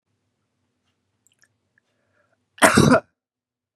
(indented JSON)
{
  "cough_length": "3.8 s",
  "cough_amplitude": 32767,
  "cough_signal_mean_std_ratio": 0.24,
  "survey_phase": "beta (2021-08-13 to 2022-03-07)",
  "age": "45-64",
  "gender": "Male",
  "wearing_mask": "No",
  "symptom_none": true,
  "smoker_status": "Ex-smoker",
  "respiratory_condition_asthma": false,
  "respiratory_condition_other": false,
  "recruitment_source": "REACT",
  "submission_delay": "2 days",
  "covid_test_result": "Negative",
  "covid_test_method": "RT-qPCR"
}